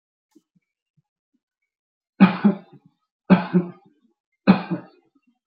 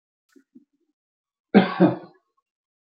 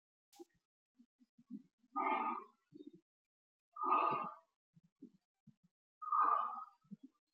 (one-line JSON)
{"three_cough_length": "5.5 s", "three_cough_amplitude": 26861, "three_cough_signal_mean_std_ratio": 0.26, "cough_length": "3.0 s", "cough_amplitude": 29493, "cough_signal_mean_std_ratio": 0.24, "exhalation_length": "7.3 s", "exhalation_amplitude": 2617, "exhalation_signal_mean_std_ratio": 0.39, "survey_phase": "beta (2021-08-13 to 2022-03-07)", "age": "18-44", "gender": "Male", "wearing_mask": "No", "symptom_none": true, "smoker_status": "Never smoked", "respiratory_condition_asthma": false, "respiratory_condition_other": false, "recruitment_source": "REACT", "submission_delay": "0 days", "covid_test_result": "Negative", "covid_test_method": "RT-qPCR"}